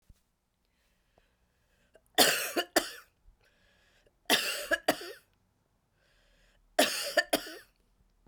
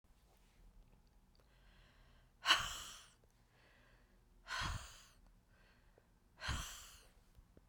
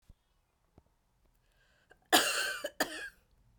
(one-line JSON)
{"three_cough_length": "8.3 s", "three_cough_amplitude": 16605, "three_cough_signal_mean_std_ratio": 0.31, "exhalation_length": "7.7 s", "exhalation_amplitude": 5121, "exhalation_signal_mean_std_ratio": 0.32, "cough_length": "3.6 s", "cough_amplitude": 10380, "cough_signal_mean_std_ratio": 0.31, "survey_phase": "beta (2021-08-13 to 2022-03-07)", "age": "18-44", "gender": "Female", "wearing_mask": "No", "symptom_cough_any": true, "symptom_new_continuous_cough": true, "symptom_runny_or_blocked_nose": true, "symptom_shortness_of_breath": true, "symptom_sore_throat": true, "symptom_fatigue": true, "symptom_fever_high_temperature": true, "symptom_headache": true, "symptom_onset": "3 days", "smoker_status": "Never smoked", "respiratory_condition_asthma": false, "respiratory_condition_other": false, "recruitment_source": "Test and Trace", "submission_delay": "2 days", "covid_test_result": "Positive", "covid_test_method": "ePCR"}